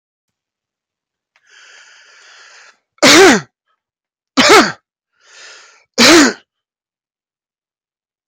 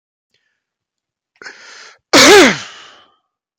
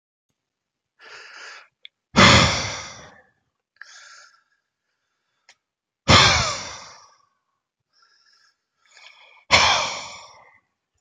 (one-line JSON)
{"three_cough_length": "8.3 s", "three_cough_amplitude": 32768, "three_cough_signal_mean_std_ratio": 0.32, "cough_length": "3.6 s", "cough_amplitude": 32768, "cough_signal_mean_std_ratio": 0.33, "exhalation_length": "11.0 s", "exhalation_amplitude": 29793, "exhalation_signal_mean_std_ratio": 0.29, "survey_phase": "beta (2021-08-13 to 2022-03-07)", "age": "45-64", "gender": "Male", "wearing_mask": "No", "symptom_loss_of_taste": true, "symptom_onset": "5 days", "smoker_status": "Ex-smoker", "respiratory_condition_asthma": false, "respiratory_condition_other": false, "recruitment_source": "Test and Trace", "submission_delay": "1 day", "covid_test_result": "Positive", "covid_test_method": "RT-qPCR", "covid_ct_value": 19.8, "covid_ct_gene": "ORF1ab gene"}